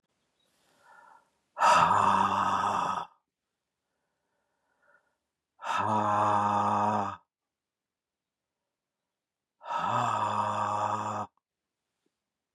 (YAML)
exhalation_length: 12.5 s
exhalation_amplitude: 11559
exhalation_signal_mean_std_ratio: 0.5
survey_phase: beta (2021-08-13 to 2022-03-07)
age: 45-64
gender: Male
wearing_mask: 'No'
symptom_none: true
smoker_status: Never smoked
respiratory_condition_asthma: false
respiratory_condition_other: false
recruitment_source: REACT
submission_delay: 0 days
covid_test_result: Negative
covid_test_method: RT-qPCR
influenza_a_test_result: Negative
influenza_b_test_result: Negative